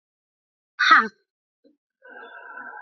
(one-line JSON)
{"exhalation_length": "2.8 s", "exhalation_amplitude": 28024, "exhalation_signal_mean_std_ratio": 0.27, "survey_phase": "alpha (2021-03-01 to 2021-08-12)", "age": "45-64", "gender": "Female", "wearing_mask": "No", "symptom_fever_high_temperature": true, "symptom_loss_of_taste": true, "symptom_onset": "7 days", "smoker_status": "Never smoked", "respiratory_condition_asthma": false, "respiratory_condition_other": false, "recruitment_source": "Test and Trace", "submission_delay": "1 day", "covid_test_result": "Positive", "covid_test_method": "RT-qPCR", "covid_ct_value": 12.5, "covid_ct_gene": "ORF1ab gene", "covid_ct_mean": 12.9, "covid_viral_load": "58000000 copies/ml", "covid_viral_load_category": "High viral load (>1M copies/ml)"}